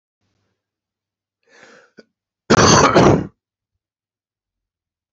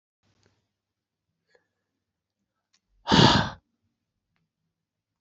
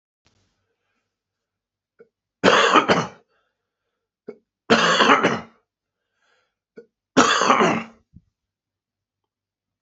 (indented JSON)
{
  "cough_length": "5.1 s",
  "cough_amplitude": 30302,
  "cough_signal_mean_std_ratio": 0.31,
  "exhalation_length": "5.2 s",
  "exhalation_amplitude": 21375,
  "exhalation_signal_mean_std_ratio": 0.21,
  "three_cough_length": "9.8 s",
  "three_cough_amplitude": 28034,
  "three_cough_signal_mean_std_ratio": 0.34,
  "survey_phase": "beta (2021-08-13 to 2022-03-07)",
  "age": "65+",
  "gender": "Male",
  "wearing_mask": "No",
  "symptom_cough_any": true,
  "symptom_runny_or_blocked_nose": true,
  "symptom_headache": true,
  "smoker_status": "Never smoked",
  "respiratory_condition_asthma": true,
  "respiratory_condition_other": true,
  "recruitment_source": "Test and Trace",
  "submission_delay": "1 day",
  "covid_test_result": "Positive",
  "covid_test_method": "LFT"
}